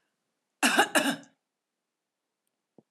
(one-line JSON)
{"cough_length": "2.9 s", "cough_amplitude": 12436, "cough_signal_mean_std_ratio": 0.3, "survey_phase": "beta (2021-08-13 to 2022-03-07)", "age": "45-64", "gender": "Female", "wearing_mask": "No", "symptom_headache": true, "symptom_onset": "13 days", "smoker_status": "Ex-smoker", "respiratory_condition_asthma": false, "respiratory_condition_other": false, "recruitment_source": "REACT", "submission_delay": "1 day", "covid_test_result": "Negative", "covid_test_method": "RT-qPCR", "influenza_a_test_result": "Negative", "influenza_b_test_result": "Negative"}